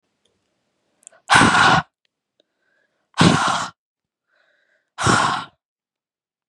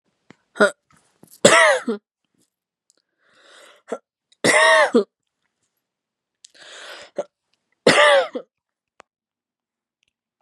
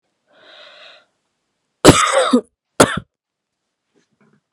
{"exhalation_length": "6.5 s", "exhalation_amplitude": 32109, "exhalation_signal_mean_std_ratio": 0.36, "three_cough_length": "10.4 s", "three_cough_amplitude": 32768, "three_cough_signal_mean_std_ratio": 0.31, "cough_length": "4.5 s", "cough_amplitude": 32768, "cough_signal_mean_std_ratio": 0.28, "survey_phase": "beta (2021-08-13 to 2022-03-07)", "age": "18-44", "gender": "Female", "wearing_mask": "No", "symptom_runny_or_blocked_nose": true, "smoker_status": "Never smoked", "respiratory_condition_asthma": true, "respiratory_condition_other": false, "recruitment_source": "REACT", "submission_delay": "1 day", "covid_test_result": "Negative", "covid_test_method": "RT-qPCR", "influenza_a_test_result": "Negative", "influenza_b_test_result": "Negative"}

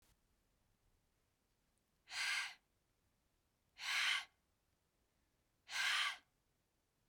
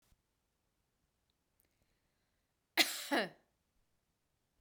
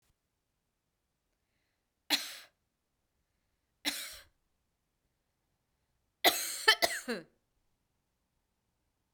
{"exhalation_length": "7.1 s", "exhalation_amplitude": 1672, "exhalation_signal_mean_std_ratio": 0.35, "cough_length": "4.6 s", "cough_amplitude": 6505, "cough_signal_mean_std_ratio": 0.21, "three_cough_length": "9.1 s", "three_cough_amplitude": 11095, "three_cough_signal_mean_std_ratio": 0.22, "survey_phase": "beta (2021-08-13 to 2022-03-07)", "age": "18-44", "gender": "Female", "wearing_mask": "No", "symptom_cough_any": true, "symptom_new_continuous_cough": true, "symptom_runny_or_blocked_nose": true, "symptom_fatigue": true, "symptom_onset": "3 days", "smoker_status": "Never smoked", "respiratory_condition_asthma": false, "respiratory_condition_other": false, "recruitment_source": "Test and Trace", "submission_delay": "2 days", "covid_test_result": "Positive", "covid_test_method": "RT-qPCR", "covid_ct_value": 29.9, "covid_ct_gene": "ORF1ab gene", "covid_ct_mean": 30.6, "covid_viral_load": "90 copies/ml", "covid_viral_load_category": "Minimal viral load (< 10K copies/ml)"}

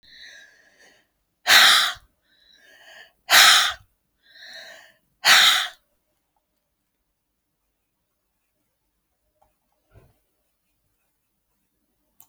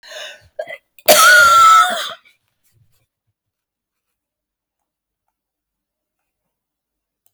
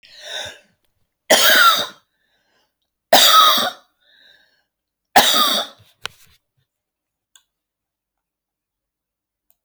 {"exhalation_length": "12.3 s", "exhalation_amplitude": 32767, "exhalation_signal_mean_std_ratio": 0.26, "cough_length": "7.3 s", "cough_amplitude": 32768, "cough_signal_mean_std_ratio": 0.32, "three_cough_length": "9.6 s", "three_cough_amplitude": 32768, "three_cough_signal_mean_std_ratio": 0.33, "survey_phase": "alpha (2021-03-01 to 2021-08-12)", "age": "65+", "gender": "Female", "wearing_mask": "No", "symptom_none": true, "smoker_status": "Ex-smoker", "respiratory_condition_asthma": false, "respiratory_condition_other": false, "recruitment_source": "REACT", "submission_delay": "1 day", "covid_test_result": "Negative", "covid_test_method": "RT-qPCR"}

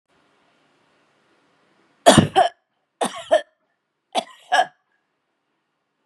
{"three_cough_length": "6.1 s", "three_cough_amplitude": 32767, "three_cough_signal_mean_std_ratio": 0.25, "survey_phase": "beta (2021-08-13 to 2022-03-07)", "age": "45-64", "gender": "Female", "wearing_mask": "No", "symptom_loss_of_taste": true, "smoker_status": "Ex-smoker", "respiratory_condition_asthma": false, "respiratory_condition_other": false, "recruitment_source": "Test and Trace", "submission_delay": "2 days", "covid_test_result": "Positive", "covid_test_method": "RT-qPCR", "covid_ct_value": 32.4, "covid_ct_gene": "N gene"}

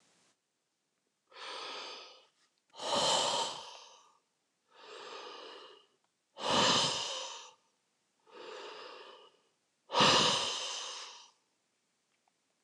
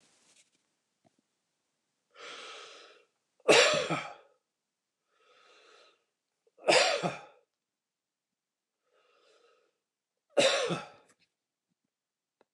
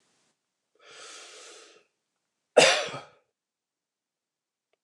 {"exhalation_length": "12.6 s", "exhalation_amplitude": 7384, "exhalation_signal_mean_std_ratio": 0.41, "three_cough_length": "12.5 s", "three_cough_amplitude": 12621, "three_cough_signal_mean_std_ratio": 0.26, "cough_length": "4.8 s", "cough_amplitude": 19247, "cough_signal_mean_std_ratio": 0.2, "survey_phase": "beta (2021-08-13 to 2022-03-07)", "age": "65+", "gender": "Male", "wearing_mask": "No", "symptom_none": true, "smoker_status": "Ex-smoker", "respiratory_condition_asthma": false, "respiratory_condition_other": false, "recruitment_source": "REACT", "submission_delay": "2 days", "covid_test_result": "Negative", "covid_test_method": "RT-qPCR", "influenza_a_test_result": "Negative", "influenza_b_test_result": "Negative"}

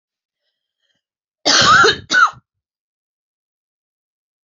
{"cough_length": "4.4 s", "cough_amplitude": 28842, "cough_signal_mean_std_ratio": 0.33, "survey_phase": "beta (2021-08-13 to 2022-03-07)", "age": "45-64", "gender": "Female", "wearing_mask": "No", "symptom_cough_any": true, "symptom_runny_or_blocked_nose": true, "symptom_shortness_of_breath": true, "symptom_sore_throat": true, "symptom_fatigue": true, "symptom_headache": true, "symptom_change_to_sense_of_smell_or_taste": true, "smoker_status": "Never smoked", "respiratory_condition_asthma": false, "respiratory_condition_other": false, "recruitment_source": "Test and Trace", "submission_delay": "0 days", "covid_test_result": "Negative", "covid_test_method": "LFT"}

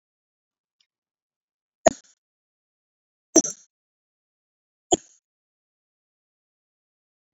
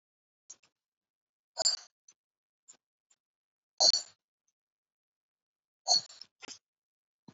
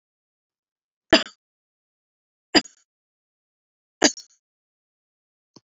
{"three_cough_length": "7.3 s", "three_cough_amplitude": 28461, "three_cough_signal_mean_std_ratio": 0.11, "exhalation_length": "7.3 s", "exhalation_amplitude": 8794, "exhalation_signal_mean_std_ratio": 0.2, "cough_length": "5.6 s", "cough_amplitude": 28245, "cough_signal_mean_std_ratio": 0.14, "survey_phase": "beta (2021-08-13 to 2022-03-07)", "age": "65+", "gender": "Female", "wearing_mask": "No", "symptom_none": true, "smoker_status": "Ex-smoker", "respiratory_condition_asthma": false, "respiratory_condition_other": false, "recruitment_source": "REACT", "submission_delay": "3 days", "covid_test_result": "Negative", "covid_test_method": "RT-qPCR", "influenza_a_test_result": "Unknown/Void", "influenza_b_test_result": "Unknown/Void"}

